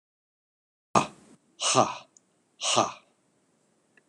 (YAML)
exhalation_length: 4.1 s
exhalation_amplitude: 18964
exhalation_signal_mean_std_ratio: 0.3
survey_phase: beta (2021-08-13 to 2022-03-07)
age: 65+
gender: Male
wearing_mask: 'No'
symptom_cough_any: true
symptom_runny_or_blocked_nose: true
smoker_status: Never smoked
respiratory_condition_asthma: false
respiratory_condition_other: false
recruitment_source: Test and Trace
submission_delay: 2 days
covid_test_result: Positive
covid_test_method: LFT